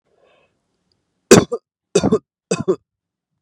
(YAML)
three_cough_length: 3.4 s
three_cough_amplitude: 32768
three_cough_signal_mean_std_ratio: 0.27
survey_phase: beta (2021-08-13 to 2022-03-07)
age: 18-44
gender: Male
wearing_mask: 'No'
symptom_none: true
smoker_status: Never smoked
respiratory_condition_asthma: false
respiratory_condition_other: false
recruitment_source: REACT
submission_delay: 0 days
covid_test_result: Negative
covid_test_method: RT-qPCR
influenza_a_test_result: Negative
influenza_b_test_result: Negative